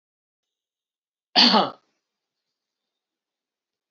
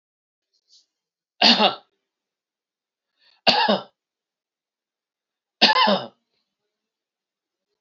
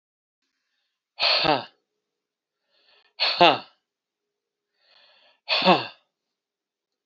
{
  "cough_length": "3.9 s",
  "cough_amplitude": 23984,
  "cough_signal_mean_std_ratio": 0.22,
  "three_cough_length": "7.8 s",
  "three_cough_amplitude": 30491,
  "three_cough_signal_mean_std_ratio": 0.28,
  "exhalation_length": "7.1 s",
  "exhalation_amplitude": 27674,
  "exhalation_signal_mean_std_ratio": 0.28,
  "survey_phase": "beta (2021-08-13 to 2022-03-07)",
  "age": "45-64",
  "gender": "Male",
  "wearing_mask": "No",
  "symptom_none": true,
  "smoker_status": "Never smoked",
  "respiratory_condition_asthma": false,
  "respiratory_condition_other": false,
  "recruitment_source": "REACT",
  "submission_delay": "0 days",
  "covid_test_result": "Negative",
  "covid_test_method": "RT-qPCR"
}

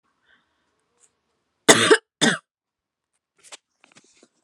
{
  "cough_length": "4.4 s",
  "cough_amplitude": 32767,
  "cough_signal_mean_std_ratio": 0.22,
  "survey_phase": "alpha (2021-03-01 to 2021-08-12)",
  "age": "18-44",
  "gender": "Female",
  "wearing_mask": "No",
  "symptom_none": true,
  "smoker_status": "Never smoked",
  "respiratory_condition_asthma": true,
  "respiratory_condition_other": false,
  "recruitment_source": "REACT",
  "submission_delay": "3 days",
  "covid_test_result": "Negative",
  "covid_test_method": "RT-qPCR"
}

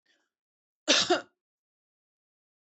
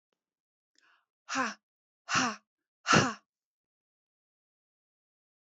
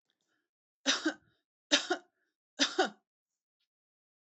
{
  "cough_length": "2.6 s",
  "cough_amplitude": 12460,
  "cough_signal_mean_std_ratio": 0.25,
  "exhalation_length": "5.5 s",
  "exhalation_amplitude": 11554,
  "exhalation_signal_mean_std_ratio": 0.26,
  "three_cough_length": "4.4 s",
  "three_cough_amplitude": 11105,
  "three_cough_signal_mean_std_ratio": 0.28,
  "survey_phase": "beta (2021-08-13 to 2022-03-07)",
  "age": "45-64",
  "gender": "Female",
  "wearing_mask": "No",
  "symptom_sore_throat": true,
  "symptom_onset": "13 days",
  "smoker_status": "Never smoked",
  "respiratory_condition_asthma": false,
  "respiratory_condition_other": false,
  "recruitment_source": "REACT",
  "submission_delay": "10 days",
  "covid_test_result": "Negative",
  "covid_test_method": "RT-qPCR"
}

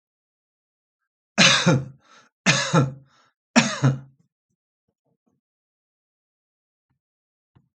{
  "three_cough_length": "7.8 s",
  "three_cough_amplitude": 28334,
  "three_cough_signal_mean_std_ratio": 0.3,
  "survey_phase": "alpha (2021-03-01 to 2021-08-12)",
  "age": "65+",
  "gender": "Male",
  "wearing_mask": "No",
  "symptom_cough_any": true,
  "symptom_fatigue": true,
  "symptom_onset": "3 days",
  "smoker_status": "Ex-smoker",
  "respiratory_condition_asthma": false,
  "respiratory_condition_other": false,
  "recruitment_source": "Test and Trace",
  "submission_delay": "1 day",
  "covid_test_result": "Positive",
  "covid_test_method": "RT-qPCR",
  "covid_ct_value": 21.4,
  "covid_ct_gene": "ORF1ab gene",
  "covid_ct_mean": 22.1,
  "covid_viral_load": "55000 copies/ml",
  "covid_viral_load_category": "Low viral load (10K-1M copies/ml)"
}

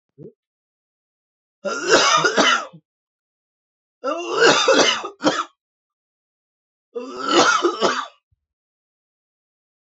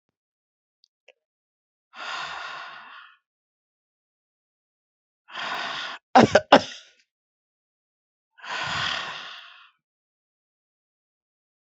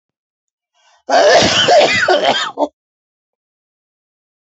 {
  "three_cough_length": "9.8 s",
  "three_cough_amplitude": 30079,
  "three_cough_signal_mean_std_ratio": 0.43,
  "exhalation_length": "11.6 s",
  "exhalation_amplitude": 28233,
  "exhalation_signal_mean_std_ratio": 0.23,
  "cough_length": "4.4 s",
  "cough_amplitude": 32767,
  "cough_signal_mean_std_ratio": 0.5,
  "survey_phase": "beta (2021-08-13 to 2022-03-07)",
  "age": "45-64",
  "gender": "Male",
  "wearing_mask": "No",
  "symptom_cough_any": true,
  "symptom_new_continuous_cough": true,
  "symptom_runny_or_blocked_nose": true,
  "symptom_sore_throat": true,
  "symptom_fatigue": true,
  "symptom_fever_high_temperature": true,
  "symptom_headache": true,
  "symptom_other": true,
  "symptom_onset": "3 days",
  "smoker_status": "Ex-smoker",
  "respiratory_condition_asthma": false,
  "respiratory_condition_other": false,
  "recruitment_source": "Test and Trace",
  "submission_delay": "3 days",
  "covid_test_result": "Positive",
  "covid_test_method": "RT-qPCR",
  "covid_ct_value": 28.4,
  "covid_ct_gene": "N gene",
  "covid_ct_mean": 28.4,
  "covid_viral_load": "480 copies/ml",
  "covid_viral_load_category": "Minimal viral load (< 10K copies/ml)"
}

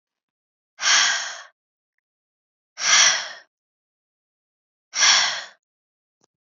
{
  "exhalation_length": "6.6 s",
  "exhalation_amplitude": 24473,
  "exhalation_signal_mean_std_ratio": 0.35,
  "survey_phase": "beta (2021-08-13 to 2022-03-07)",
  "age": "18-44",
  "gender": "Female",
  "wearing_mask": "No",
  "symptom_cough_any": true,
  "symptom_onset": "11 days",
  "smoker_status": "Never smoked",
  "respiratory_condition_asthma": false,
  "respiratory_condition_other": false,
  "recruitment_source": "REACT",
  "submission_delay": "3 days",
  "covid_test_result": "Negative",
  "covid_test_method": "RT-qPCR",
  "influenza_a_test_result": "Negative",
  "influenza_b_test_result": "Negative"
}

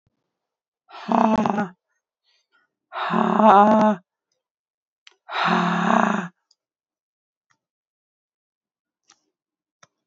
{
  "exhalation_length": "10.1 s",
  "exhalation_amplitude": 32768,
  "exhalation_signal_mean_std_ratio": 0.38,
  "survey_phase": "beta (2021-08-13 to 2022-03-07)",
  "age": "45-64",
  "gender": "Female",
  "wearing_mask": "No",
  "symptom_cough_any": true,
  "symptom_runny_or_blocked_nose": true,
  "symptom_shortness_of_breath": true,
  "symptom_sore_throat": true,
  "symptom_fatigue": true,
  "symptom_fever_high_temperature": true,
  "symptom_headache": true,
  "symptom_change_to_sense_of_smell_or_taste": true,
  "symptom_loss_of_taste": true,
  "symptom_other": true,
  "symptom_onset": "4 days",
  "smoker_status": "Never smoked",
  "respiratory_condition_asthma": false,
  "respiratory_condition_other": false,
  "recruitment_source": "Test and Trace",
  "submission_delay": "2 days",
  "covid_test_result": "Positive",
  "covid_test_method": "RT-qPCR"
}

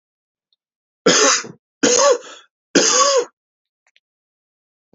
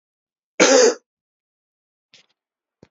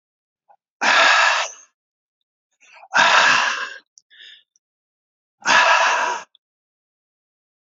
{
  "three_cough_length": "4.9 s",
  "three_cough_amplitude": 29517,
  "three_cough_signal_mean_std_ratio": 0.42,
  "cough_length": "2.9 s",
  "cough_amplitude": 32508,
  "cough_signal_mean_std_ratio": 0.28,
  "exhalation_length": "7.7 s",
  "exhalation_amplitude": 27273,
  "exhalation_signal_mean_std_ratio": 0.44,
  "survey_phase": "beta (2021-08-13 to 2022-03-07)",
  "age": "45-64",
  "gender": "Male",
  "wearing_mask": "No",
  "symptom_sore_throat": true,
  "symptom_fatigue": true,
  "symptom_headache": true,
  "symptom_onset": "13 days",
  "smoker_status": "Never smoked",
  "respiratory_condition_asthma": false,
  "respiratory_condition_other": false,
  "recruitment_source": "REACT",
  "submission_delay": "2 days",
  "covid_test_result": "Negative",
  "covid_test_method": "RT-qPCR",
  "influenza_a_test_result": "Negative",
  "influenza_b_test_result": "Negative"
}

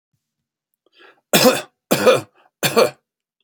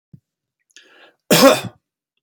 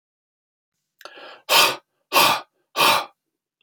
{
  "three_cough_length": "3.4 s",
  "three_cough_amplitude": 32767,
  "three_cough_signal_mean_std_ratio": 0.36,
  "cough_length": "2.2 s",
  "cough_amplitude": 30672,
  "cough_signal_mean_std_ratio": 0.29,
  "exhalation_length": "3.6 s",
  "exhalation_amplitude": 27861,
  "exhalation_signal_mean_std_ratio": 0.38,
  "survey_phase": "beta (2021-08-13 to 2022-03-07)",
  "age": "45-64",
  "gender": "Male",
  "wearing_mask": "No",
  "symptom_none": true,
  "smoker_status": "Never smoked",
  "respiratory_condition_asthma": false,
  "respiratory_condition_other": false,
  "recruitment_source": "REACT",
  "submission_delay": "3 days",
  "covid_test_result": "Negative",
  "covid_test_method": "RT-qPCR"
}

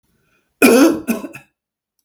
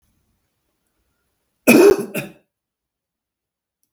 {
  "exhalation_length": "2.0 s",
  "exhalation_amplitude": 32768,
  "exhalation_signal_mean_std_ratio": 0.4,
  "cough_length": "3.9 s",
  "cough_amplitude": 32768,
  "cough_signal_mean_std_ratio": 0.25,
  "survey_phase": "beta (2021-08-13 to 2022-03-07)",
  "age": "65+",
  "gender": "Male",
  "wearing_mask": "No",
  "symptom_none": true,
  "symptom_onset": "6 days",
  "smoker_status": "Ex-smoker",
  "respiratory_condition_asthma": false,
  "respiratory_condition_other": false,
  "recruitment_source": "REACT",
  "submission_delay": "1 day",
  "covid_test_result": "Negative",
  "covid_test_method": "RT-qPCR"
}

